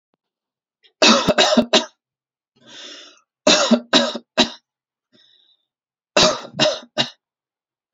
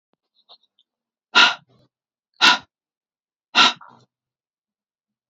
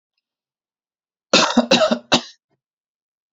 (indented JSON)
{
  "three_cough_length": "7.9 s",
  "three_cough_amplitude": 32514,
  "three_cough_signal_mean_std_ratio": 0.38,
  "exhalation_length": "5.3 s",
  "exhalation_amplitude": 30127,
  "exhalation_signal_mean_std_ratio": 0.24,
  "cough_length": "3.3 s",
  "cough_amplitude": 31123,
  "cough_signal_mean_std_ratio": 0.33,
  "survey_phase": "beta (2021-08-13 to 2022-03-07)",
  "age": "18-44",
  "gender": "Male",
  "wearing_mask": "No",
  "symptom_none": true,
  "smoker_status": "Never smoked",
  "respiratory_condition_asthma": false,
  "respiratory_condition_other": false,
  "recruitment_source": "REACT",
  "submission_delay": "2 days",
  "covid_test_result": "Negative",
  "covid_test_method": "RT-qPCR",
  "influenza_a_test_result": "Negative",
  "influenza_b_test_result": "Negative"
}